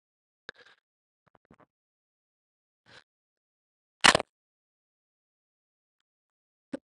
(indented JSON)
{
  "exhalation_length": "7.0 s",
  "exhalation_amplitude": 25649,
  "exhalation_signal_mean_std_ratio": 0.09,
  "survey_phase": "beta (2021-08-13 to 2022-03-07)",
  "age": "18-44",
  "gender": "Female",
  "wearing_mask": "No",
  "symptom_cough_any": true,
  "symptom_new_continuous_cough": true,
  "symptom_runny_or_blocked_nose": true,
  "symptom_shortness_of_breath": true,
  "symptom_sore_throat": true,
  "symptom_abdominal_pain": true,
  "symptom_diarrhoea": true,
  "symptom_fatigue": true,
  "symptom_fever_high_temperature": true,
  "symptom_headache": true,
  "symptom_onset": "4 days",
  "smoker_status": "Ex-smoker",
  "respiratory_condition_asthma": false,
  "respiratory_condition_other": false,
  "recruitment_source": "Test and Trace",
  "submission_delay": "1 day",
  "covid_test_result": "Positive",
  "covid_test_method": "RT-qPCR",
  "covid_ct_value": 23.4,
  "covid_ct_gene": "N gene"
}